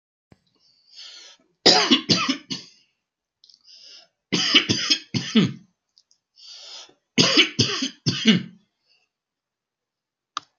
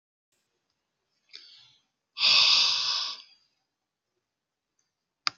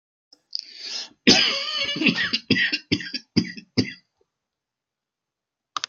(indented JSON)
{
  "three_cough_length": "10.6 s",
  "three_cough_amplitude": 31573,
  "three_cough_signal_mean_std_ratio": 0.37,
  "exhalation_length": "5.4 s",
  "exhalation_amplitude": 18443,
  "exhalation_signal_mean_std_ratio": 0.33,
  "cough_length": "5.9 s",
  "cough_amplitude": 27707,
  "cough_signal_mean_std_ratio": 0.42,
  "survey_phase": "beta (2021-08-13 to 2022-03-07)",
  "age": "65+",
  "gender": "Male",
  "wearing_mask": "No",
  "symptom_cough_any": true,
  "smoker_status": "Ex-smoker",
  "respiratory_condition_asthma": false,
  "respiratory_condition_other": false,
  "recruitment_source": "REACT",
  "submission_delay": "2 days",
  "covid_test_result": "Negative",
  "covid_test_method": "RT-qPCR",
  "influenza_a_test_result": "Negative",
  "influenza_b_test_result": "Negative"
}